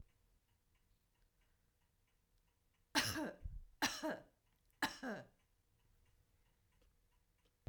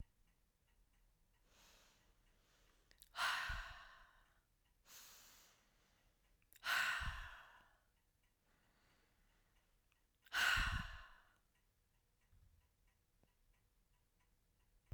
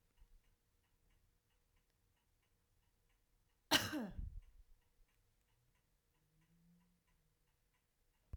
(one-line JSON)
{"three_cough_length": "7.7 s", "three_cough_amplitude": 2395, "three_cough_signal_mean_std_ratio": 0.31, "exhalation_length": "14.9 s", "exhalation_amplitude": 1910, "exhalation_signal_mean_std_ratio": 0.31, "cough_length": "8.4 s", "cough_amplitude": 4078, "cough_signal_mean_std_ratio": 0.21, "survey_phase": "beta (2021-08-13 to 2022-03-07)", "age": "45-64", "gender": "Female", "wearing_mask": "No", "symptom_none": true, "smoker_status": "Never smoked", "respiratory_condition_asthma": false, "respiratory_condition_other": false, "recruitment_source": "REACT", "submission_delay": "3 days", "covid_test_result": "Negative", "covid_test_method": "RT-qPCR", "influenza_a_test_result": "Negative", "influenza_b_test_result": "Negative"}